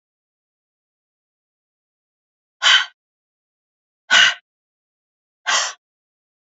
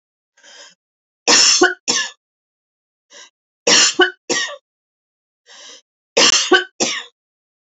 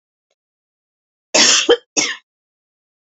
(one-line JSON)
{"exhalation_length": "6.6 s", "exhalation_amplitude": 29241, "exhalation_signal_mean_std_ratio": 0.24, "three_cough_length": "7.8 s", "three_cough_amplitude": 32768, "three_cough_signal_mean_std_ratio": 0.38, "cough_length": "3.2 s", "cough_amplitude": 31268, "cough_signal_mean_std_ratio": 0.33, "survey_phase": "alpha (2021-03-01 to 2021-08-12)", "age": "45-64", "gender": "Female", "wearing_mask": "No", "symptom_none": true, "symptom_onset": "12 days", "smoker_status": "Never smoked", "respiratory_condition_asthma": false, "respiratory_condition_other": false, "recruitment_source": "REACT", "submission_delay": "3 days", "covid_test_result": "Negative", "covid_test_method": "RT-qPCR"}